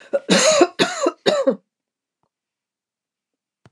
{"cough_length": "3.7 s", "cough_amplitude": 28631, "cough_signal_mean_std_ratio": 0.41, "survey_phase": "beta (2021-08-13 to 2022-03-07)", "age": "65+", "gender": "Female", "wearing_mask": "No", "symptom_none": true, "smoker_status": "Never smoked", "respiratory_condition_asthma": false, "respiratory_condition_other": false, "recruitment_source": "REACT", "submission_delay": "1 day", "covid_test_result": "Negative", "covid_test_method": "RT-qPCR", "influenza_a_test_result": "Negative", "influenza_b_test_result": "Negative"}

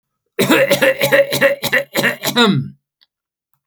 {"cough_length": "3.7 s", "cough_amplitude": 31982, "cough_signal_mean_std_ratio": 0.61, "survey_phase": "alpha (2021-03-01 to 2021-08-12)", "age": "65+", "gender": "Male", "wearing_mask": "No", "symptom_none": true, "smoker_status": "Never smoked", "respiratory_condition_asthma": false, "respiratory_condition_other": false, "recruitment_source": "REACT", "submission_delay": "1 day", "covid_test_result": "Negative", "covid_test_method": "RT-qPCR"}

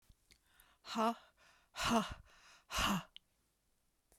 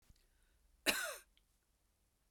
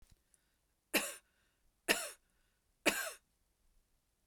{"exhalation_length": "4.2 s", "exhalation_amplitude": 2831, "exhalation_signal_mean_std_ratio": 0.39, "cough_length": "2.3 s", "cough_amplitude": 4841, "cough_signal_mean_std_ratio": 0.27, "three_cough_length": "4.3 s", "three_cough_amplitude": 6677, "three_cough_signal_mean_std_ratio": 0.27, "survey_phase": "beta (2021-08-13 to 2022-03-07)", "age": "45-64", "gender": "Female", "wearing_mask": "No", "symptom_none": true, "smoker_status": "Never smoked", "respiratory_condition_asthma": false, "respiratory_condition_other": false, "recruitment_source": "REACT", "submission_delay": "2 days", "covid_test_result": "Negative", "covid_test_method": "RT-qPCR"}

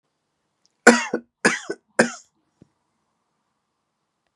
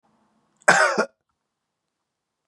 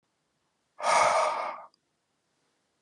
{"three_cough_length": "4.4 s", "three_cough_amplitude": 32768, "three_cough_signal_mean_std_ratio": 0.22, "cough_length": "2.5 s", "cough_amplitude": 30339, "cough_signal_mean_std_ratio": 0.28, "exhalation_length": "2.8 s", "exhalation_amplitude": 8716, "exhalation_signal_mean_std_ratio": 0.41, "survey_phase": "beta (2021-08-13 to 2022-03-07)", "age": "45-64", "gender": "Male", "wearing_mask": "No", "symptom_cough_any": true, "symptom_runny_or_blocked_nose": true, "symptom_sore_throat": true, "symptom_headache": true, "smoker_status": "Never smoked", "respiratory_condition_asthma": false, "respiratory_condition_other": false, "recruitment_source": "Test and Trace", "submission_delay": "2 days", "covid_test_result": "Positive", "covid_test_method": "LFT"}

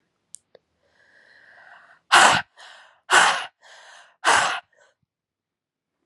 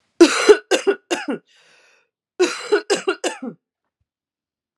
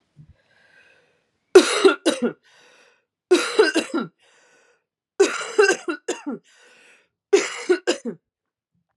{"exhalation_length": "6.1 s", "exhalation_amplitude": 30736, "exhalation_signal_mean_std_ratio": 0.31, "cough_length": "4.8 s", "cough_amplitude": 32768, "cough_signal_mean_std_ratio": 0.36, "three_cough_length": "9.0 s", "three_cough_amplitude": 32762, "three_cough_signal_mean_std_ratio": 0.35, "survey_phase": "alpha (2021-03-01 to 2021-08-12)", "age": "18-44", "gender": "Female", "wearing_mask": "No", "symptom_cough_any": true, "symptom_new_continuous_cough": true, "symptom_fatigue": true, "symptom_fever_high_temperature": true, "symptom_headache": true, "symptom_change_to_sense_of_smell_or_taste": true, "symptom_loss_of_taste": true, "symptom_onset": "4 days", "smoker_status": "Never smoked", "respiratory_condition_asthma": false, "respiratory_condition_other": false, "recruitment_source": "Test and Trace", "submission_delay": "2 days", "covid_test_result": "Positive", "covid_test_method": "RT-qPCR"}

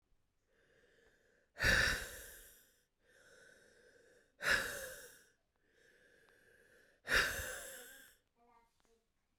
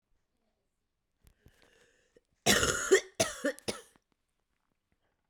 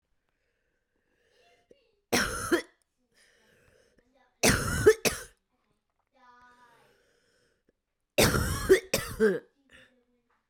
{"exhalation_length": "9.4 s", "exhalation_amplitude": 3742, "exhalation_signal_mean_std_ratio": 0.33, "cough_length": "5.3 s", "cough_amplitude": 12593, "cough_signal_mean_std_ratio": 0.28, "three_cough_length": "10.5 s", "three_cough_amplitude": 14285, "three_cough_signal_mean_std_ratio": 0.31, "survey_phase": "beta (2021-08-13 to 2022-03-07)", "age": "18-44", "gender": "Female", "wearing_mask": "No", "symptom_cough_any": true, "symptom_sore_throat": true, "symptom_fever_high_temperature": true, "symptom_headache": true, "symptom_onset": "3 days", "smoker_status": "Ex-smoker", "respiratory_condition_asthma": false, "respiratory_condition_other": false, "recruitment_source": "Test and Trace", "submission_delay": "1 day", "covid_test_result": "Positive", "covid_test_method": "RT-qPCR", "covid_ct_value": 23.1, "covid_ct_gene": "N gene"}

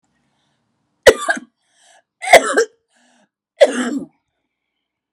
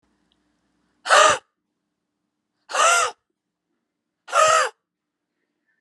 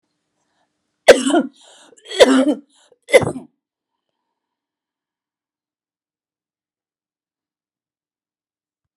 {"three_cough_length": "5.1 s", "three_cough_amplitude": 32768, "three_cough_signal_mean_std_ratio": 0.27, "exhalation_length": "5.8 s", "exhalation_amplitude": 28471, "exhalation_signal_mean_std_ratio": 0.34, "cough_length": "9.0 s", "cough_amplitude": 32768, "cough_signal_mean_std_ratio": 0.22, "survey_phase": "alpha (2021-03-01 to 2021-08-12)", "age": "45-64", "gender": "Female", "wearing_mask": "No", "symptom_none": true, "smoker_status": "Never smoked", "respiratory_condition_asthma": false, "respiratory_condition_other": false, "recruitment_source": "REACT", "submission_delay": "1 day", "covid_test_result": "Negative", "covid_test_method": "RT-qPCR"}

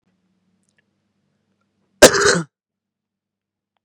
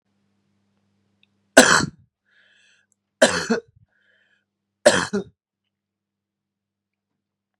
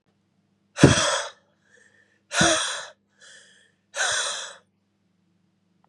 {"cough_length": "3.8 s", "cough_amplitude": 32768, "cough_signal_mean_std_ratio": 0.21, "three_cough_length": "7.6 s", "three_cough_amplitude": 32768, "three_cough_signal_mean_std_ratio": 0.23, "exhalation_length": "5.9 s", "exhalation_amplitude": 30496, "exhalation_signal_mean_std_ratio": 0.34, "survey_phase": "beta (2021-08-13 to 2022-03-07)", "age": "18-44", "gender": "Male", "wearing_mask": "No", "symptom_cough_any": true, "symptom_runny_or_blocked_nose": true, "symptom_sore_throat": true, "symptom_diarrhoea": true, "symptom_fatigue": true, "symptom_headache": true, "symptom_change_to_sense_of_smell_or_taste": true, "smoker_status": "Ex-smoker", "respiratory_condition_asthma": false, "respiratory_condition_other": false, "recruitment_source": "Test and Trace", "submission_delay": "1 day", "covid_test_result": "Positive", "covid_test_method": "LFT"}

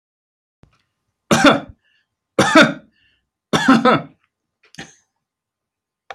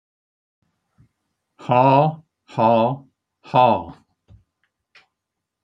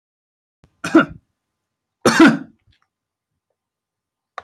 {"three_cough_length": "6.1 s", "three_cough_amplitude": 31903, "three_cough_signal_mean_std_ratio": 0.32, "exhalation_length": "5.6 s", "exhalation_amplitude": 26801, "exhalation_signal_mean_std_ratio": 0.36, "cough_length": "4.4 s", "cough_amplitude": 28214, "cough_signal_mean_std_ratio": 0.25, "survey_phase": "alpha (2021-03-01 to 2021-08-12)", "age": "65+", "gender": "Male", "wearing_mask": "No", "symptom_none": true, "smoker_status": "Never smoked", "respiratory_condition_asthma": false, "respiratory_condition_other": false, "recruitment_source": "REACT", "submission_delay": "1 day", "covid_test_result": "Negative", "covid_test_method": "RT-qPCR"}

